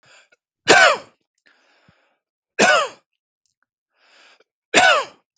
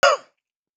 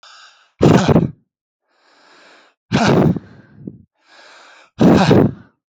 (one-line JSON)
{"three_cough_length": "5.4 s", "three_cough_amplitude": 32768, "three_cough_signal_mean_std_ratio": 0.32, "cough_length": "0.8 s", "cough_amplitude": 27105, "cough_signal_mean_std_ratio": 0.34, "exhalation_length": "5.7 s", "exhalation_amplitude": 32768, "exhalation_signal_mean_std_ratio": 0.43, "survey_phase": "beta (2021-08-13 to 2022-03-07)", "age": "45-64", "gender": "Male", "wearing_mask": "No", "symptom_none": true, "smoker_status": "Never smoked", "respiratory_condition_asthma": true, "respiratory_condition_other": false, "recruitment_source": "REACT", "submission_delay": "3 days", "covid_test_result": "Negative", "covid_test_method": "RT-qPCR", "influenza_a_test_result": "Negative", "influenza_b_test_result": "Negative"}